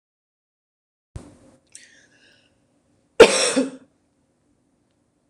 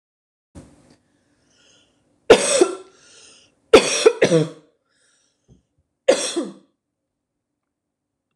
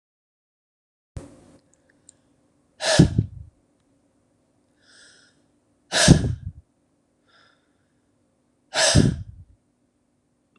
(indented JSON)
{
  "cough_length": "5.3 s",
  "cough_amplitude": 26028,
  "cough_signal_mean_std_ratio": 0.19,
  "three_cough_length": "8.4 s",
  "three_cough_amplitude": 26028,
  "three_cough_signal_mean_std_ratio": 0.27,
  "exhalation_length": "10.6 s",
  "exhalation_amplitude": 26028,
  "exhalation_signal_mean_std_ratio": 0.25,
  "survey_phase": "beta (2021-08-13 to 2022-03-07)",
  "age": "18-44",
  "gender": "Female",
  "wearing_mask": "No",
  "symptom_none": true,
  "smoker_status": "Never smoked",
  "respiratory_condition_asthma": true,
  "respiratory_condition_other": false,
  "recruitment_source": "REACT",
  "submission_delay": "2 days",
  "covid_test_result": "Negative",
  "covid_test_method": "RT-qPCR",
  "influenza_a_test_result": "Negative",
  "influenza_b_test_result": "Negative"
}